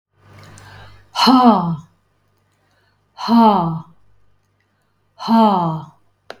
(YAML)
exhalation_length: 6.4 s
exhalation_amplitude: 32766
exhalation_signal_mean_std_ratio: 0.43
survey_phase: beta (2021-08-13 to 2022-03-07)
age: 45-64
gender: Female
wearing_mask: 'No'
symptom_none: true
smoker_status: Current smoker (e-cigarettes or vapes only)
respiratory_condition_asthma: true
respiratory_condition_other: false
recruitment_source: REACT
submission_delay: 1 day
covid_test_result: Negative
covid_test_method: RT-qPCR
influenza_a_test_result: Negative
influenza_b_test_result: Negative